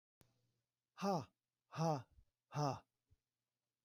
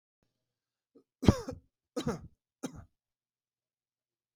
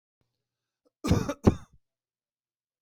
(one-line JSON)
{"exhalation_length": "3.8 s", "exhalation_amplitude": 1423, "exhalation_signal_mean_std_ratio": 0.35, "three_cough_length": "4.4 s", "three_cough_amplitude": 16373, "three_cough_signal_mean_std_ratio": 0.18, "cough_length": "2.8 s", "cough_amplitude": 18001, "cough_signal_mean_std_ratio": 0.24, "survey_phase": "beta (2021-08-13 to 2022-03-07)", "age": "65+", "gender": "Male", "wearing_mask": "No", "symptom_none": true, "smoker_status": "Never smoked", "respiratory_condition_asthma": false, "respiratory_condition_other": false, "recruitment_source": "REACT", "submission_delay": "3 days", "covid_test_result": "Negative", "covid_test_method": "RT-qPCR", "influenza_a_test_result": "Negative", "influenza_b_test_result": "Negative"}